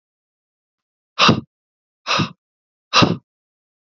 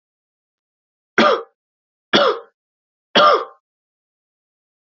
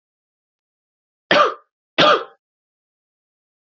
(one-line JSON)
{"exhalation_length": "3.8 s", "exhalation_amplitude": 30410, "exhalation_signal_mean_std_ratio": 0.3, "three_cough_length": "4.9 s", "three_cough_amplitude": 30082, "three_cough_signal_mean_std_ratio": 0.31, "cough_length": "3.7 s", "cough_amplitude": 29736, "cough_signal_mean_std_ratio": 0.27, "survey_phase": "beta (2021-08-13 to 2022-03-07)", "age": "18-44", "gender": "Male", "wearing_mask": "No", "symptom_cough_any": true, "symptom_new_continuous_cough": true, "symptom_runny_or_blocked_nose": true, "symptom_sore_throat": true, "symptom_headache": true, "smoker_status": "Never smoked", "respiratory_condition_asthma": false, "respiratory_condition_other": false, "recruitment_source": "Test and Trace", "submission_delay": "1 day", "covid_test_result": "Positive", "covid_test_method": "ePCR"}